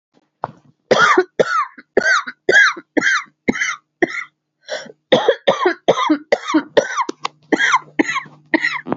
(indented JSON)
{
  "cough_length": "9.0 s",
  "cough_amplitude": 32116,
  "cough_signal_mean_std_ratio": 0.52,
  "survey_phase": "alpha (2021-03-01 to 2021-08-12)",
  "age": "45-64",
  "gender": "Female",
  "wearing_mask": "No",
  "symptom_cough_any": true,
  "symptom_fatigue": true,
  "symptom_headache": true,
  "symptom_change_to_sense_of_smell_or_taste": true,
  "symptom_loss_of_taste": true,
  "symptom_onset": "5 days",
  "smoker_status": "Ex-smoker",
  "respiratory_condition_asthma": false,
  "respiratory_condition_other": false,
  "recruitment_source": "Test and Trace",
  "submission_delay": "1 day",
  "covid_test_result": "Positive",
  "covid_test_method": "RT-qPCR"
}